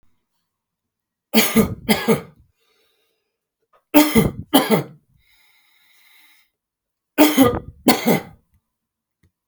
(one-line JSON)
{"three_cough_length": "9.5 s", "three_cough_amplitude": 32768, "three_cough_signal_mean_std_ratio": 0.35, "survey_phase": "alpha (2021-03-01 to 2021-08-12)", "age": "45-64", "gender": "Male", "wearing_mask": "No", "symptom_none": true, "smoker_status": "Ex-smoker", "respiratory_condition_asthma": false, "respiratory_condition_other": false, "recruitment_source": "REACT", "submission_delay": "1 day", "covid_test_result": "Negative", "covid_test_method": "RT-qPCR"}